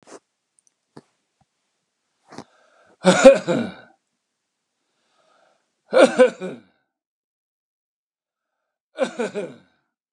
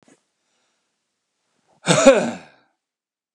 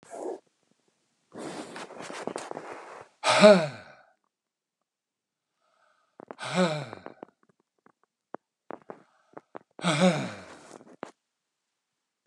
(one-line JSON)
{"three_cough_length": "10.1 s", "three_cough_amplitude": 32768, "three_cough_signal_mean_std_ratio": 0.23, "cough_length": "3.3 s", "cough_amplitude": 32767, "cough_signal_mean_std_ratio": 0.26, "exhalation_length": "12.3 s", "exhalation_amplitude": 27601, "exhalation_signal_mean_std_ratio": 0.27, "survey_phase": "beta (2021-08-13 to 2022-03-07)", "age": "65+", "gender": "Male", "wearing_mask": "No", "symptom_none": true, "smoker_status": "Never smoked", "respiratory_condition_asthma": false, "respiratory_condition_other": false, "recruitment_source": "REACT", "submission_delay": "1 day", "covid_test_result": "Negative", "covid_test_method": "RT-qPCR"}